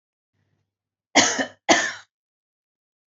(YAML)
cough_length: 3.1 s
cough_amplitude: 27648
cough_signal_mean_std_ratio: 0.3
survey_phase: alpha (2021-03-01 to 2021-08-12)
age: 18-44
gender: Female
wearing_mask: 'No'
symptom_none: true
smoker_status: Ex-smoker
respiratory_condition_asthma: false
respiratory_condition_other: false
recruitment_source: REACT
submission_delay: 3 days
covid_test_result: Negative
covid_test_method: RT-qPCR